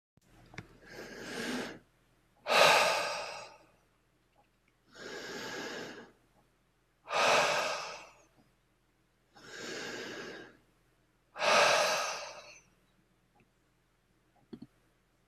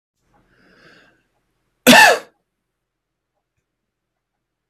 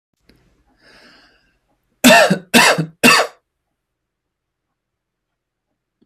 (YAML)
exhalation_length: 15.3 s
exhalation_amplitude: 10956
exhalation_signal_mean_std_ratio: 0.39
cough_length: 4.7 s
cough_amplitude: 32768
cough_signal_mean_std_ratio: 0.21
three_cough_length: 6.1 s
three_cough_amplitude: 32768
three_cough_signal_mean_std_ratio: 0.3
survey_phase: beta (2021-08-13 to 2022-03-07)
age: 18-44
gender: Male
wearing_mask: 'No'
symptom_sore_throat: true
symptom_diarrhoea: true
smoker_status: Never smoked
respiratory_condition_asthma: true
respiratory_condition_other: false
recruitment_source: REACT
submission_delay: 1 day
covid_test_result: Negative
covid_test_method: RT-qPCR